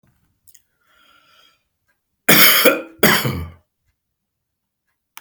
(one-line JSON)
{"cough_length": "5.2 s", "cough_amplitude": 32768, "cough_signal_mean_std_ratio": 0.32, "survey_phase": "beta (2021-08-13 to 2022-03-07)", "age": "65+", "gender": "Male", "wearing_mask": "No", "symptom_none": true, "smoker_status": "Never smoked", "respiratory_condition_asthma": false, "respiratory_condition_other": false, "recruitment_source": "REACT", "submission_delay": "1 day", "covid_test_result": "Negative", "covid_test_method": "RT-qPCR"}